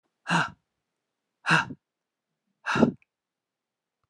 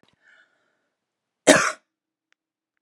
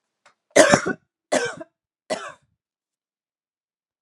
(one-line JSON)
{"exhalation_length": "4.1 s", "exhalation_amplitude": 17803, "exhalation_signal_mean_std_ratio": 0.3, "cough_length": "2.8 s", "cough_amplitude": 32767, "cough_signal_mean_std_ratio": 0.2, "three_cough_length": "4.0 s", "three_cough_amplitude": 32767, "three_cough_signal_mean_std_ratio": 0.27, "survey_phase": "alpha (2021-03-01 to 2021-08-12)", "age": "45-64", "gender": "Female", "wearing_mask": "No", "symptom_none": true, "symptom_onset": "5 days", "smoker_status": "Ex-smoker", "respiratory_condition_asthma": false, "respiratory_condition_other": false, "recruitment_source": "REACT", "submission_delay": "2 days", "covid_test_result": "Negative", "covid_test_method": "RT-qPCR"}